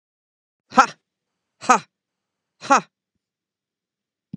{"exhalation_length": "4.4 s", "exhalation_amplitude": 32767, "exhalation_signal_mean_std_ratio": 0.19, "survey_phase": "beta (2021-08-13 to 2022-03-07)", "age": "45-64", "gender": "Female", "wearing_mask": "No", "symptom_none": true, "smoker_status": "Ex-smoker", "respiratory_condition_asthma": false, "respiratory_condition_other": false, "recruitment_source": "REACT", "submission_delay": "2 days", "covid_test_result": "Negative", "covid_test_method": "RT-qPCR", "influenza_a_test_result": "Unknown/Void", "influenza_b_test_result": "Unknown/Void"}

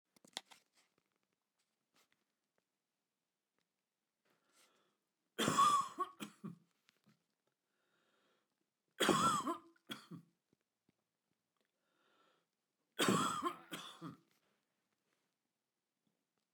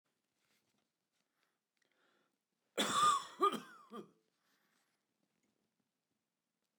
{"three_cough_length": "16.5 s", "three_cough_amplitude": 3294, "three_cough_signal_mean_std_ratio": 0.27, "cough_length": "6.8 s", "cough_amplitude": 2727, "cough_signal_mean_std_ratio": 0.25, "survey_phase": "beta (2021-08-13 to 2022-03-07)", "age": "45-64", "gender": "Male", "wearing_mask": "No", "symptom_none": true, "symptom_onset": "12 days", "smoker_status": "Ex-smoker", "respiratory_condition_asthma": false, "respiratory_condition_other": false, "recruitment_source": "REACT", "submission_delay": "1 day", "covid_test_result": "Negative", "covid_test_method": "RT-qPCR", "influenza_a_test_result": "Negative", "influenza_b_test_result": "Negative"}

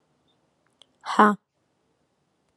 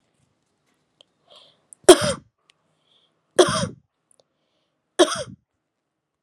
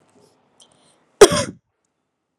{"exhalation_length": "2.6 s", "exhalation_amplitude": 27495, "exhalation_signal_mean_std_ratio": 0.21, "three_cough_length": "6.2 s", "three_cough_amplitude": 32768, "three_cough_signal_mean_std_ratio": 0.2, "cough_length": "2.4 s", "cough_amplitude": 32768, "cough_signal_mean_std_ratio": 0.19, "survey_phase": "alpha (2021-03-01 to 2021-08-12)", "age": "18-44", "gender": "Female", "wearing_mask": "No", "symptom_fatigue": true, "symptom_headache": true, "symptom_change_to_sense_of_smell_or_taste": true, "symptom_loss_of_taste": true, "smoker_status": "Never smoked", "respiratory_condition_asthma": false, "respiratory_condition_other": false, "recruitment_source": "Test and Trace", "submission_delay": "2 days", "covid_test_result": "Positive", "covid_test_method": "RT-qPCR", "covid_ct_value": 15.6, "covid_ct_gene": "N gene", "covid_ct_mean": 15.7, "covid_viral_load": "6800000 copies/ml", "covid_viral_load_category": "High viral load (>1M copies/ml)"}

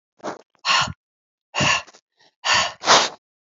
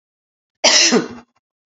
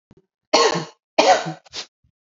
{"exhalation_length": "3.5 s", "exhalation_amplitude": 32534, "exhalation_signal_mean_std_ratio": 0.43, "cough_length": "1.8 s", "cough_amplitude": 32768, "cough_signal_mean_std_ratio": 0.4, "three_cough_length": "2.2 s", "three_cough_amplitude": 32768, "three_cough_signal_mean_std_ratio": 0.41, "survey_phase": "alpha (2021-03-01 to 2021-08-12)", "age": "45-64", "gender": "Female", "wearing_mask": "No", "symptom_cough_any": true, "symptom_fatigue": true, "symptom_fever_high_temperature": true, "symptom_headache": true, "symptom_change_to_sense_of_smell_or_taste": true, "symptom_loss_of_taste": true, "symptom_onset": "4 days", "smoker_status": "Ex-smoker", "respiratory_condition_asthma": false, "respiratory_condition_other": false, "recruitment_source": "Test and Trace", "submission_delay": "2 days", "covid_test_result": "Positive", "covid_test_method": "RT-qPCR"}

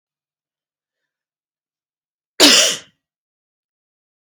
{"cough_length": "4.4 s", "cough_amplitude": 32583, "cough_signal_mean_std_ratio": 0.22, "survey_phase": "beta (2021-08-13 to 2022-03-07)", "age": "18-44", "gender": "Female", "wearing_mask": "No", "symptom_cough_any": true, "symptom_runny_or_blocked_nose": true, "symptom_fatigue": true, "symptom_fever_high_temperature": true, "symptom_headache": true, "smoker_status": "Never smoked", "respiratory_condition_asthma": false, "respiratory_condition_other": false, "recruitment_source": "Test and Trace", "submission_delay": "4 days", "covid_test_result": "Negative", "covid_test_method": "RT-qPCR"}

